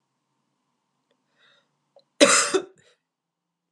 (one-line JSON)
{"cough_length": "3.7 s", "cough_amplitude": 28898, "cough_signal_mean_std_ratio": 0.23, "survey_phase": "beta (2021-08-13 to 2022-03-07)", "age": "18-44", "gender": "Female", "wearing_mask": "No", "symptom_cough_any": true, "symptom_runny_or_blocked_nose": true, "symptom_sore_throat": true, "symptom_abdominal_pain": true, "symptom_fatigue": true, "symptom_headache": true, "symptom_onset": "8 days", "smoker_status": "Ex-smoker", "respiratory_condition_asthma": false, "respiratory_condition_other": false, "recruitment_source": "REACT", "submission_delay": "2 days", "covid_test_result": "Negative", "covid_test_method": "RT-qPCR", "influenza_a_test_result": "Unknown/Void", "influenza_b_test_result": "Unknown/Void"}